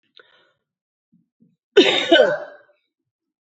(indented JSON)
{
  "cough_length": "3.4 s",
  "cough_amplitude": 28078,
  "cough_signal_mean_std_ratio": 0.31,
  "survey_phase": "beta (2021-08-13 to 2022-03-07)",
  "age": "45-64",
  "gender": "Female",
  "wearing_mask": "No",
  "symptom_cough_any": true,
  "symptom_runny_or_blocked_nose": true,
  "symptom_sore_throat": true,
  "symptom_diarrhoea": true,
  "symptom_headache": true,
  "symptom_onset": "3 days",
  "smoker_status": "Never smoked",
  "respiratory_condition_asthma": false,
  "respiratory_condition_other": false,
  "recruitment_source": "Test and Trace",
  "submission_delay": "1 day",
  "covid_test_result": "Negative",
  "covid_test_method": "RT-qPCR"
}